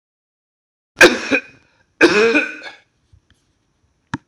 {
  "cough_length": "4.3 s",
  "cough_amplitude": 26028,
  "cough_signal_mean_std_ratio": 0.33,
  "survey_phase": "alpha (2021-03-01 to 2021-08-12)",
  "age": "45-64",
  "gender": "Male",
  "wearing_mask": "No",
  "symptom_cough_any": true,
  "symptom_fatigue": true,
  "symptom_headache": true,
  "smoker_status": "Never smoked",
  "respiratory_condition_asthma": false,
  "respiratory_condition_other": true,
  "recruitment_source": "Test and Trace",
  "submission_delay": "2 days",
  "covid_test_result": "Positive",
  "covid_test_method": "LFT"
}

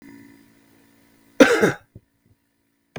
{
  "cough_length": "3.0 s",
  "cough_amplitude": 32768,
  "cough_signal_mean_std_ratio": 0.25,
  "survey_phase": "beta (2021-08-13 to 2022-03-07)",
  "age": "45-64",
  "gender": "Male",
  "wearing_mask": "No",
  "symptom_none": true,
  "smoker_status": "Ex-smoker",
  "respiratory_condition_asthma": false,
  "respiratory_condition_other": false,
  "recruitment_source": "REACT",
  "submission_delay": "2 days",
  "covid_test_result": "Negative",
  "covid_test_method": "RT-qPCR",
  "influenza_a_test_result": "Negative",
  "influenza_b_test_result": "Negative"
}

